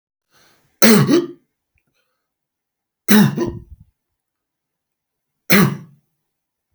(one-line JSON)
{"three_cough_length": "6.7 s", "three_cough_amplitude": 32768, "three_cough_signal_mean_std_ratio": 0.32, "survey_phase": "beta (2021-08-13 to 2022-03-07)", "age": "45-64", "gender": "Male", "wearing_mask": "No", "symptom_none": true, "smoker_status": "Never smoked", "respiratory_condition_asthma": false, "respiratory_condition_other": false, "recruitment_source": "REACT", "submission_delay": "2 days", "covid_test_result": "Negative", "covid_test_method": "RT-qPCR", "influenza_a_test_result": "Negative", "influenza_b_test_result": "Negative"}